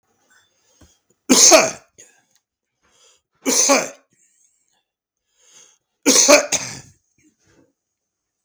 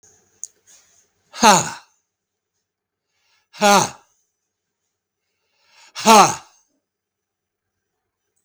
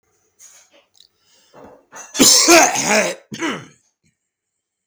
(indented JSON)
{
  "three_cough_length": "8.4 s",
  "three_cough_amplitude": 32768,
  "three_cough_signal_mean_std_ratio": 0.3,
  "exhalation_length": "8.4 s",
  "exhalation_amplitude": 32768,
  "exhalation_signal_mean_std_ratio": 0.24,
  "cough_length": "4.9 s",
  "cough_amplitude": 32768,
  "cough_signal_mean_std_ratio": 0.38,
  "survey_phase": "beta (2021-08-13 to 2022-03-07)",
  "age": "65+",
  "gender": "Male",
  "wearing_mask": "No",
  "symptom_cough_any": true,
  "symptom_sore_throat": true,
  "smoker_status": "Ex-smoker",
  "respiratory_condition_asthma": false,
  "respiratory_condition_other": false,
  "recruitment_source": "REACT",
  "submission_delay": "2 days",
  "covid_test_result": "Negative",
  "covid_test_method": "RT-qPCR",
  "influenza_a_test_result": "Negative",
  "influenza_b_test_result": "Negative"
}